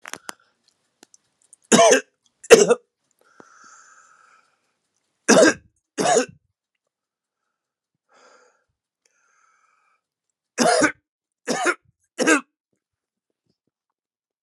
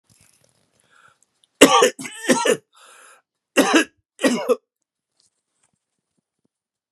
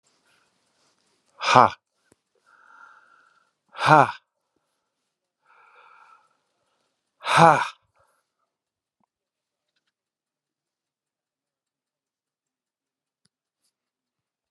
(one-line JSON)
{"three_cough_length": "14.4 s", "three_cough_amplitude": 32768, "three_cough_signal_mean_std_ratio": 0.26, "cough_length": "6.9 s", "cough_amplitude": 32768, "cough_signal_mean_std_ratio": 0.3, "exhalation_length": "14.5 s", "exhalation_amplitude": 32768, "exhalation_signal_mean_std_ratio": 0.17, "survey_phase": "alpha (2021-03-01 to 2021-08-12)", "age": "65+", "gender": "Male", "wearing_mask": "No", "symptom_none": true, "smoker_status": "Never smoked", "respiratory_condition_asthma": false, "respiratory_condition_other": false, "recruitment_source": "REACT", "submission_delay": "1 day", "covid_test_result": "Negative", "covid_test_method": "RT-qPCR"}